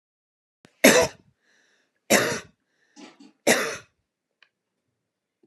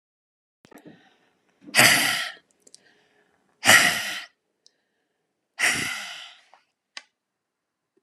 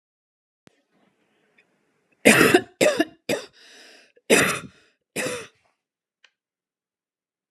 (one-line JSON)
{"three_cough_length": "5.5 s", "three_cough_amplitude": 31328, "three_cough_signal_mean_std_ratio": 0.27, "exhalation_length": "8.0 s", "exhalation_amplitude": 31911, "exhalation_signal_mean_std_ratio": 0.31, "cough_length": "7.5 s", "cough_amplitude": 32267, "cough_signal_mean_std_ratio": 0.29, "survey_phase": "alpha (2021-03-01 to 2021-08-12)", "age": "45-64", "gender": "Female", "wearing_mask": "No", "symptom_none": true, "smoker_status": "Never smoked", "respiratory_condition_asthma": false, "respiratory_condition_other": false, "recruitment_source": "REACT", "submission_delay": "1 day", "covid_test_result": "Negative", "covid_test_method": "RT-qPCR"}